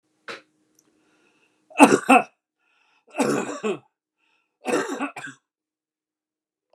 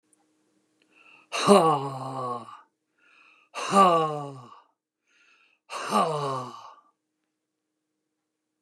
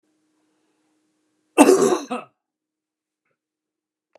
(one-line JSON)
{"three_cough_length": "6.7 s", "three_cough_amplitude": 29204, "three_cough_signal_mean_std_ratio": 0.28, "exhalation_length": "8.6 s", "exhalation_amplitude": 24821, "exhalation_signal_mean_std_ratio": 0.37, "cough_length": "4.2 s", "cough_amplitude": 29204, "cough_signal_mean_std_ratio": 0.25, "survey_phase": "beta (2021-08-13 to 2022-03-07)", "age": "65+", "gender": "Male", "wearing_mask": "No", "symptom_none": true, "smoker_status": "Never smoked", "respiratory_condition_asthma": false, "respiratory_condition_other": false, "recruitment_source": "REACT", "submission_delay": "1 day", "covid_test_result": "Negative", "covid_test_method": "RT-qPCR", "influenza_a_test_result": "Negative", "influenza_b_test_result": "Negative"}